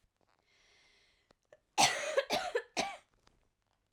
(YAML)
three_cough_length: 3.9 s
three_cough_amplitude: 8290
three_cough_signal_mean_std_ratio: 0.34
survey_phase: alpha (2021-03-01 to 2021-08-12)
age: 18-44
gender: Female
wearing_mask: 'No'
symptom_cough_any: true
symptom_new_continuous_cough: true
symptom_fatigue: true
symptom_fever_high_temperature: true
symptom_headache: true
symptom_change_to_sense_of_smell_or_taste: true
symptom_loss_of_taste: true
symptom_onset: 4 days
smoker_status: Never smoked
respiratory_condition_asthma: false
respiratory_condition_other: false
recruitment_source: Test and Trace
submission_delay: 2 days
covid_test_result: Positive
covid_test_method: RT-qPCR
covid_ct_value: 14.1
covid_ct_gene: S gene
covid_ct_mean: 14.3
covid_viral_load: 20000000 copies/ml
covid_viral_load_category: High viral load (>1M copies/ml)